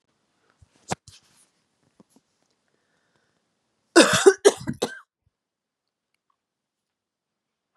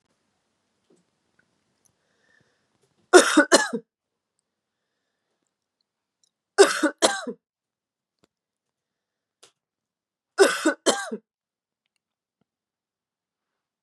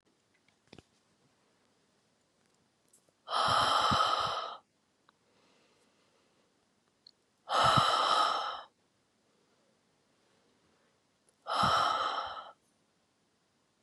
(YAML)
cough_length: 7.8 s
cough_amplitude: 32747
cough_signal_mean_std_ratio: 0.19
three_cough_length: 13.8 s
three_cough_amplitude: 32739
three_cough_signal_mean_std_ratio: 0.21
exhalation_length: 13.8 s
exhalation_amplitude: 8316
exhalation_signal_mean_std_ratio: 0.39
survey_phase: beta (2021-08-13 to 2022-03-07)
age: 18-44
gender: Female
wearing_mask: 'No'
symptom_shortness_of_breath: true
smoker_status: Never smoked
respiratory_condition_asthma: false
respiratory_condition_other: false
recruitment_source: Test and Trace
submission_delay: 1 day
covid_test_result: Positive
covid_test_method: RT-qPCR
covid_ct_value: 25.8
covid_ct_gene: ORF1ab gene